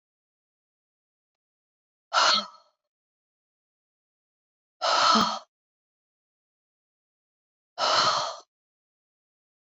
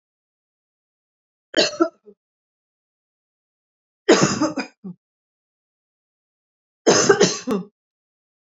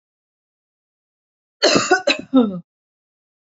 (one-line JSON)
{"exhalation_length": "9.7 s", "exhalation_amplitude": 12568, "exhalation_signal_mean_std_ratio": 0.3, "three_cough_length": "8.5 s", "three_cough_amplitude": 29769, "three_cough_signal_mean_std_ratio": 0.29, "cough_length": "3.4 s", "cough_amplitude": 27582, "cough_signal_mean_std_ratio": 0.35, "survey_phase": "beta (2021-08-13 to 2022-03-07)", "age": "45-64", "gender": "Female", "wearing_mask": "No", "symptom_none": true, "smoker_status": "Never smoked", "respiratory_condition_asthma": false, "respiratory_condition_other": false, "recruitment_source": "REACT", "submission_delay": "1 day", "covid_test_result": "Negative", "covid_test_method": "RT-qPCR", "influenza_a_test_result": "Negative", "influenza_b_test_result": "Negative"}